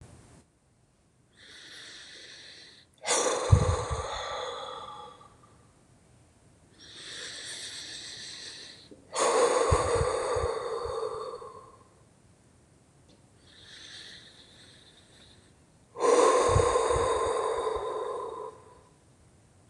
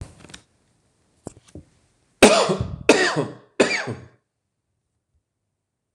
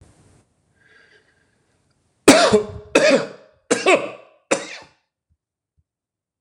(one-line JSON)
{"exhalation_length": "19.7 s", "exhalation_amplitude": 15012, "exhalation_signal_mean_std_ratio": 0.49, "three_cough_length": "5.9 s", "three_cough_amplitude": 26028, "three_cough_signal_mean_std_ratio": 0.31, "cough_length": "6.4 s", "cough_amplitude": 26028, "cough_signal_mean_std_ratio": 0.32, "survey_phase": "beta (2021-08-13 to 2022-03-07)", "age": "18-44", "gender": "Male", "wearing_mask": "No", "symptom_none": true, "smoker_status": "Ex-smoker", "respiratory_condition_asthma": false, "respiratory_condition_other": false, "recruitment_source": "REACT", "submission_delay": "1 day", "covid_test_result": "Negative", "covid_test_method": "RT-qPCR"}